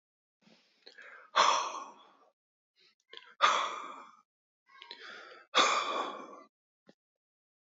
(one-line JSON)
{"exhalation_length": "7.8 s", "exhalation_amplitude": 10310, "exhalation_signal_mean_std_ratio": 0.35, "survey_phase": "alpha (2021-03-01 to 2021-08-12)", "age": "45-64", "gender": "Male", "wearing_mask": "No", "symptom_none": true, "smoker_status": "Never smoked", "respiratory_condition_asthma": false, "respiratory_condition_other": false, "recruitment_source": "Test and Trace", "submission_delay": "2 days", "covid_test_result": "Positive", "covid_test_method": "RT-qPCR", "covid_ct_value": 27.2, "covid_ct_gene": "N gene"}